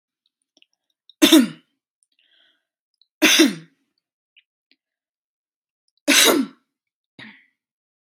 {"three_cough_length": "8.1 s", "three_cough_amplitude": 32768, "three_cough_signal_mean_std_ratio": 0.27, "survey_phase": "beta (2021-08-13 to 2022-03-07)", "age": "18-44", "gender": "Female", "wearing_mask": "No", "symptom_none": true, "smoker_status": "Never smoked", "respiratory_condition_asthma": false, "respiratory_condition_other": false, "recruitment_source": "REACT", "submission_delay": "1 day", "covid_test_method": "RT-qPCR"}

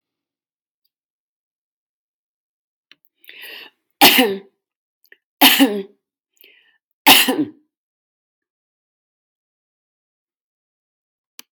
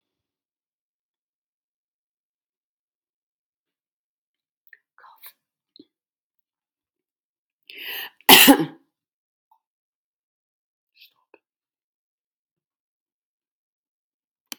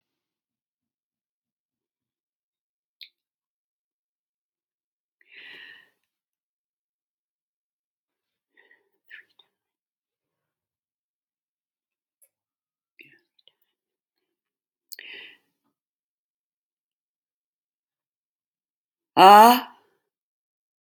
{"three_cough_length": "11.5 s", "three_cough_amplitude": 32768, "three_cough_signal_mean_std_ratio": 0.23, "cough_length": "14.6 s", "cough_amplitude": 32768, "cough_signal_mean_std_ratio": 0.12, "exhalation_length": "20.8 s", "exhalation_amplitude": 28881, "exhalation_signal_mean_std_ratio": 0.12, "survey_phase": "beta (2021-08-13 to 2022-03-07)", "age": "65+", "gender": "Female", "wearing_mask": "No", "symptom_none": true, "smoker_status": "Ex-smoker", "respiratory_condition_asthma": false, "respiratory_condition_other": false, "recruitment_source": "Test and Trace", "submission_delay": "0 days", "covid_test_result": "Negative", "covid_test_method": "LFT"}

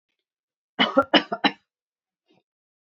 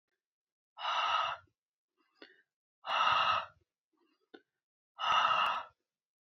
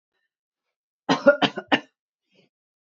{"cough_length": "2.9 s", "cough_amplitude": 24845, "cough_signal_mean_std_ratio": 0.26, "exhalation_length": "6.2 s", "exhalation_amplitude": 4914, "exhalation_signal_mean_std_ratio": 0.45, "three_cough_length": "3.0 s", "three_cough_amplitude": 26179, "three_cough_signal_mean_std_ratio": 0.24, "survey_phase": "alpha (2021-03-01 to 2021-08-12)", "age": "65+", "gender": "Female", "wearing_mask": "No", "symptom_none": true, "smoker_status": "Ex-smoker", "respiratory_condition_asthma": false, "respiratory_condition_other": false, "recruitment_source": "REACT", "submission_delay": "2 days", "covid_test_result": "Negative", "covid_test_method": "RT-qPCR"}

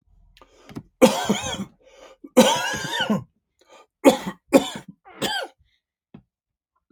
{"three_cough_length": "6.9 s", "three_cough_amplitude": 28161, "three_cough_signal_mean_std_ratio": 0.35, "survey_phase": "alpha (2021-03-01 to 2021-08-12)", "age": "45-64", "gender": "Male", "wearing_mask": "No", "symptom_none": true, "smoker_status": "Ex-smoker", "respiratory_condition_asthma": false, "respiratory_condition_other": false, "recruitment_source": "REACT", "submission_delay": "2 days", "covid_test_result": "Negative", "covid_test_method": "RT-qPCR"}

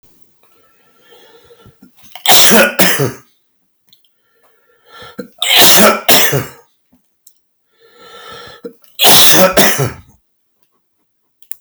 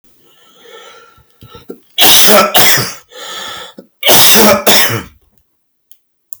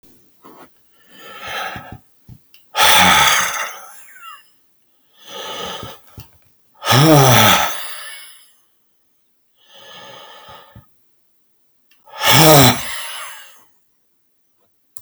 {"three_cough_length": "11.6 s", "three_cough_amplitude": 32768, "three_cough_signal_mean_std_ratio": 0.43, "cough_length": "6.4 s", "cough_amplitude": 32768, "cough_signal_mean_std_ratio": 0.53, "exhalation_length": "15.0 s", "exhalation_amplitude": 32768, "exhalation_signal_mean_std_ratio": 0.38, "survey_phase": "beta (2021-08-13 to 2022-03-07)", "age": "65+", "gender": "Male", "wearing_mask": "No", "symptom_cough_any": true, "symptom_runny_or_blocked_nose": true, "symptom_diarrhoea": true, "symptom_onset": "3 days", "smoker_status": "Ex-smoker", "respiratory_condition_asthma": false, "respiratory_condition_other": false, "recruitment_source": "Test and Trace", "submission_delay": "0 days", "covid_test_result": "Positive", "covid_test_method": "RT-qPCR", "covid_ct_value": 12.3, "covid_ct_gene": "ORF1ab gene", "covid_ct_mean": 12.6, "covid_viral_load": "73000000 copies/ml", "covid_viral_load_category": "High viral load (>1M copies/ml)"}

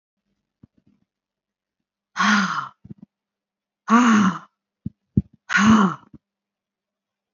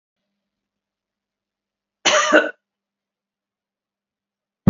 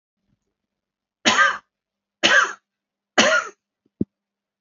{"exhalation_length": "7.3 s", "exhalation_amplitude": 25208, "exhalation_signal_mean_std_ratio": 0.36, "cough_length": "4.7 s", "cough_amplitude": 31112, "cough_signal_mean_std_ratio": 0.22, "three_cough_length": "4.6 s", "three_cough_amplitude": 30799, "three_cough_signal_mean_std_ratio": 0.34, "survey_phase": "beta (2021-08-13 to 2022-03-07)", "age": "65+", "gender": "Female", "wearing_mask": "No", "symptom_none": true, "smoker_status": "Never smoked", "respiratory_condition_asthma": false, "respiratory_condition_other": false, "recruitment_source": "REACT", "submission_delay": "6 days", "covid_test_result": "Negative", "covid_test_method": "RT-qPCR", "influenza_a_test_result": "Negative", "influenza_b_test_result": "Negative"}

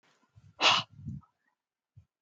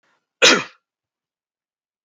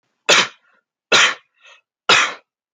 {"exhalation_length": "2.2 s", "exhalation_amplitude": 10171, "exhalation_signal_mean_std_ratio": 0.28, "cough_length": "2.0 s", "cough_amplitude": 28233, "cough_signal_mean_std_ratio": 0.24, "three_cough_length": "2.7 s", "three_cough_amplitude": 30517, "three_cough_signal_mean_std_ratio": 0.38, "survey_phase": "alpha (2021-03-01 to 2021-08-12)", "age": "45-64", "gender": "Male", "wearing_mask": "No", "symptom_none": true, "smoker_status": "Never smoked", "respiratory_condition_asthma": false, "respiratory_condition_other": false, "recruitment_source": "REACT", "submission_delay": "1 day", "covid_test_result": "Negative", "covid_test_method": "RT-qPCR"}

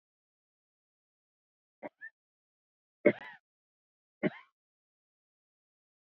{"three_cough_length": "6.1 s", "three_cough_amplitude": 10496, "three_cough_signal_mean_std_ratio": 0.13, "survey_phase": "beta (2021-08-13 to 2022-03-07)", "age": "45-64", "gender": "Female", "wearing_mask": "No", "symptom_cough_any": true, "symptom_fatigue": true, "smoker_status": "Current smoker (1 to 10 cigarettes per day)", "respiratory_condition_asthma": false, "respiratory_condition_other": false, "recruitment_source": "REACT", "submission_delay": "1 day", "covid_test_result": "Negative", "covid_test_method": "RT-qPCR", "influenza_a_test_result": "Negative", "influenza_b_test_result": "Negative"}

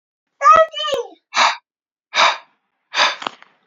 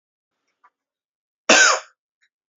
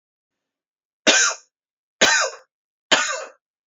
{"exhalation_length": "3.7 s", "exhalation_amplitude": 27880, "exhalation_signal_mean_std_ratio": 0.43, "cough_length": "2.6 s", "cough_amplitude": 31558, "cough_signal_mean_std_ratio": 0.27, "three_cough_length": "3.7 s", "three_cough_amplitude": 31643, "three_cough_signal_mean_std_ratio": 0.37, "survey_phase": "beta (2021-08-13 to 2022-03-07)", "age": "18-44", "gender": "Male", "wearing_mask": "No", "symptom_cough_any": true, "symptom_runny_or_blocked_nose": true, "symptom_shortness_of_breath": true, "symptom_sore_throat": true, "symptom_abdominal_pain": true, "symptom_diarrhoea": true, "symptom_fatigue": true, "symptom_fever_high_temperature": true, "symptom_headache": true, "symptom_onset": "3 days", "smoker_status": "Never smoked", "recruitment_source": "Test and Trace", "submission_delay": "2 days", "covid_test_result": "Positive", "covid_test_method": "RT-qPCR", "covid_ct_value": 22.8, "covid_ct_gene": "ORF1ab gene"}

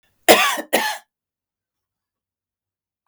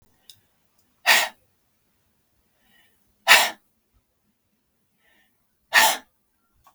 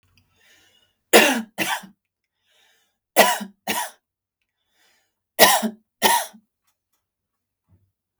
{"cough_length": "3.1 s", "cough_amplitude": 32768, "cough_signal_mean_std_ratio": 0.28, "exhalation_length": "6.7 s", "exhalation_amplitude": 32768, "exhalation_signal_mean_std_ratio": 0.24, "three_cough_length": "8.2 s", "three_cough_amplitude": 32768, "three_cough_signal_mean_std_ratio": 0.29, "survey_phase": "beta (2021-08-13 to 2022-03-07)", "age": "45-64", "gender": "Female", "wearing_mask": "No", "symptom_headache": true, "symptom_onset": "3 days", "smoker_status": "Never smoked", "respiratory_condition_asthma": true, "respiratory_condition_other": false, "recruitment_source": "Test and Trace", "submission_delay": "1 day", "covid_test_result": "Negative", "covid_test_method": "RT-qPCR"}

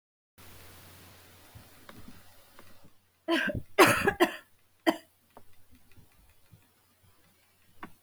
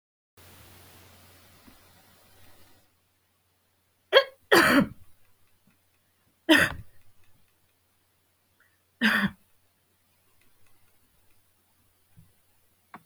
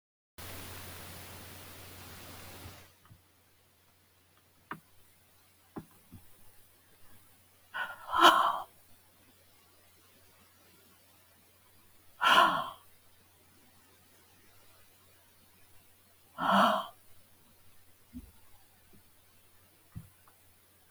{"cough_length": "8.0 s", "cough_amplitude": 15821, "cough_signal_mean_std_ratio": 0.28, "three_cough_length": "13.1 s", "three_cough_amplitude": 27086, "three_cough_signal_mean_std_ratio": 0.23, "exhalation_length": "20.9 s", "exhalation_amplitude": 14691, "exhalation_signal_mean_std_ratio": 0.26, "survey_phase": "beta (2021-08-13 to 2022-03-07)", "age": "65+", "gender": "Female", "wearing_mask": "No", "symptom_none": true, "smoker_status": "Never smoked", "respiratory_condition_asthma": false, "respiratory_condition_other": false, "recruitment_source": "REACT", "submission_delay": "17 days", "covid_test_result": "Negative", "covid_test_method": "RT-qPCR", "influenza_a_test_result": "Negative", "influenza_b_test_result": "Negative"}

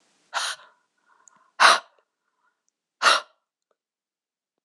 {"exhalation_length": "4.6 s", "exhalation_amplitude": 25443, "exhalation_signal_mean_std_ratio": 0.24, "survey_phase": "beta (2021-08-13 to 2022-03-07)", "age": "45-64", "gender": "Female", "wearing_mask": "No", "symptom_cough_any": true, "symptom_runny_or_blocked_nose": true, "symptom_fatigue": true, "symptom_headache": true, "smoker_status": "Never smoked", "respiratory_condition_asthma": false, "respiratory_condition_other": false, "recruitment_source": "Test and Trace", "submission_delay": "2 days", "covid_test_result": "Positive", "covid_test_method": "RT-qPCR"}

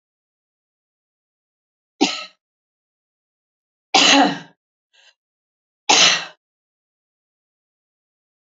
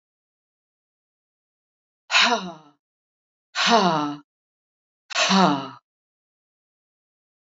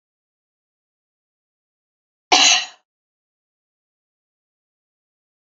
{"three_cough_length": "8.4 s", "three_cough_amplitude": 32492, "three_cough_signal_mean_std_ratio": 0.25, "exhalation_length": "7.6 s", "exhalation_amplitude": 23849, "exhalation_signal_mean_std_ratio": 0.33, "cough_length": "5.5 s", "cough_amplitude": 30009, "cough_signal_mean_std_ratio": 0.19, "survey_phase": "alpha (2021-03-01 to 2021-08-12)", "age": "65+", "gender": "Female", "wearing_mask": "No", "symptom_none": true, "smoker_status": "Never smoked", "respiratory_condition_asthma": false, "respiratory_condition_other": false, "recruitment_source": "REACT", "submission_delay": "2 days", "covid_test_result": "Negative", "covid_test_method": "RT-qPCR"}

